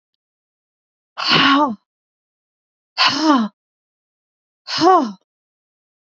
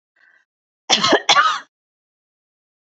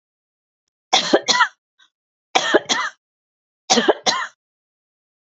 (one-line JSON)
{"exhalation_length": "6.1 s", "exhalation_amplitude": 27689, "exhalation_signal_mean_std_ratio": 0.39, "cough_length": "2.8 s", "cough_amplitude": 32768, "cough_signal_mean_std_ratio": 0.35, "three_cough_length": "5.4 s", "three_cough_amplitude": 32768, "three_cough_signal_mean_std_ratio": 0.36, "survey_phase": "beta (2021-08-13 to 2022-03-07)", "age": "65+", "gender": "Female", "wearing_mask": "No", "symptom_none": true, "smoker_status": "Ex-smoker", "respiratory_condition_asthma": false, "respiratory_condition_other": false, "recruitment_source": "REACT", "submission_delay": "3 days", "covid_test_result": "Negative", "covid_test_method": "RT-qPCR", "influenza_a_test_result": "Negative", "influenza_b_test_result": "Negative"}